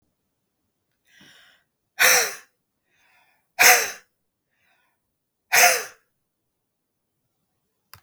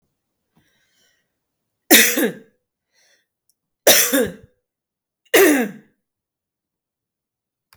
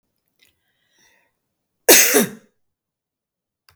{"exhalation_length": "8.0 s", "exhalation_amplitude": 31940, "exhalation_signal_mean_std_ratio": 0.25, "three_cough_length": "7.8 s", "three_cough_amplitude": 32768, "three_cough_signal_mean_std_ratio": 0.3, "cough_length": "3.8 s", "cough_amplitude": 32768, "cough_signal_mean_std_ratio": 0.25, "survey_phase": "beta (2021-08-13 to 2022-03-07)", "age": "45-64", "gender": "Female", "wearing_mask": "No", "symptom_cough_any": true, "smoker_status": "Never smoked", "respiratory_condition_asthma": false, "respiratory_condition_other": false, "recruitment_source": "REACT", "submission_delay": "1 day", "covid_test_result": "Negative", "covid_test_method": "RT-qPCR"}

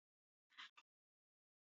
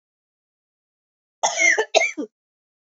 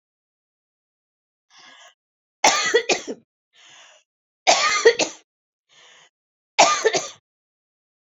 {"exhalation_length": "1.7 s", "exhalation_amplitude": 208, "exhalation_signal_mean_std_ratio": 0.23, "cough_length": "3.0 s", "cough_amplitude": 26118, "cough_signal_mean_std_ratio": 0.35, "three_cough_length": "8.2 s", "three_cough_amplitude": 30775, "three_cough_signal_mean_std_ratio": 0.32, "survey_phase": "beta (2021-08-13 to 2022-03-07)", "age": "45-64", "gender": "Female", "wearing_mask": "No", "symptom_cough_any": true, "symptom_runny_or_blocked_nose": true, "smoker_status": "Never smoked", "respiratory_condition_asthma": false, "respiratory_condition_other": false, "recruitment_source": "REACT", "submission_delay": "1 day", "covid_test_result": "Negative", "covid_test_method": "RT-qPCR"}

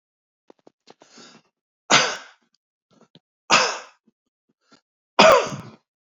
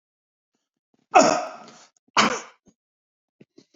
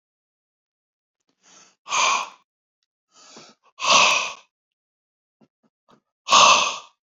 {"three_cough_length": "6.1 s", "three_cough_amplitude": 32767, "three_cough_signal_mean_std_ratio": 0.27, "cough_length": "3.8 s", "cough_amplitude": 29963, "cough_signal_mean_std_ratio": 0.27, "exhalation_length": "7.2 s", "exhalation_amplitude": 28161, "exhalation_signal_mean_std_ratio": 0.32, "survey_phase": "alpha (2021-03-01 to 2021-08-12)", "age": "65+", "gender": "Male", "wearing_mask": "No", "symptom_none": true, "smoker_status": "Never smoked", "respiratory_condition_asthma": false, "respiratory_condition_other": false, "recruitment_source": "REACT", "submission_delay": "1 day", "covid_test_result": "Negative", "covid_test_method": "RT-qPCR"}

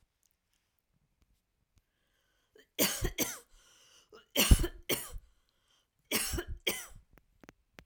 {"cough_length": "7.9 s", "cough_amplitude": 14084, "cough_signal_mean_std_ratio": 0.29, "survey_phase": "alpha (2021-03-01 to 2021-08-12)", "age": "18-44", "gender": "Female", "wearing_mask": "No", "symptom_none": true, "smoker_status": "Ex-smoker", "respiratory_condition_asthma": false, "respiratory_condition_other": false, "recruitment_source": "REACT", "submission_delay": "1 day", "covid_test_result": "Negative", "covid_test_method": "RT-qPCR"}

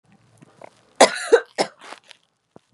{"cough_length": "2.7 s", "cough_amplitude": 32533, "cough_signal_mean_std_ratio": 0.25, "survey_phase": "beta (2021-08-13 to 2022-03-07)", "age": "18-44", "gender": "Female", "wearing_mask": "No", "symptom_cough_any": true, "symptom_runny_or_blocked_nose": true, "symptom_shortness_of_breath": true, "symptom_sore_throat": true, "symptom_fatigue": true, "smoker_status": "Never smoked", "respiratory_condition_asthma": false, "respiratory_condition_other": false, "recruitment_source": "Test and Trace", "submission_delay": "2 days", "covid_test_result": "Positive", "covid_test_method": "LFT"}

